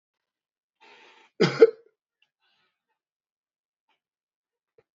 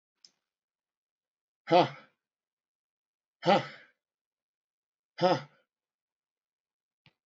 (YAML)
cough_length: 4.9 s
cough_amplitude: 24383
cough_signal_mean_std_ratio: 0.14
exhalation_length: 7.3 s
exhalation_amplitude: 11635
exhalation_signal_mean_std_ratio: 0.21
survey_phase: beta (2021-08-13 to 2022-03-07)
age: 65+
gender: Male
wearing_mask: 'No'
symptom_none: true
smoker_status: Current smoker (1 to 10 cigarettes per day)
respiratory_condition_asthma: false
respiratory_condition_other: false
recruitment_source: REACT
submission_delay: 0 days
covid_test_result: Negative
covid_test_method: RT-qPCR
influenza_a_test_result: Negative
influenza_b_test_result: Negative